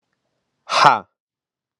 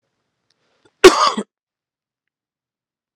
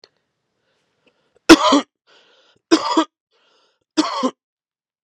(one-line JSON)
{"exhalation_length": "1.8 s", "exhalation_amplitude": 32768, "exhalation_signal_mean_std_ratio": 0.28, "cough_length": "3.2 s", "cough_amplitude": 32768, "cough_signal_mean_std_ratio": 0.21, "three_cough_length": "5.0 s", "three_cough_amplitude": 32768, "three_cough_signal_mean_std_ratio": 0.28, "survey_phase": "alpha (2021-03-01 to 2021-08-12)", "age": "18-44", "gender": "Male", "wearing_mask": "No", "symptom_fatigue": true, "symptom_onset": "2 days", "smoker_status": "Never smoked", "respiratory_condition_asthma": false, "respiratory_condition_other": false, "recruitment_source": "Test and Trace", "submission_delay": "1 day", "covid_test_result": "Positive", "covid_test_method": "RT-qPCR", "covid_ct_value": 23.2, "covid_ct_gene": "N gene"}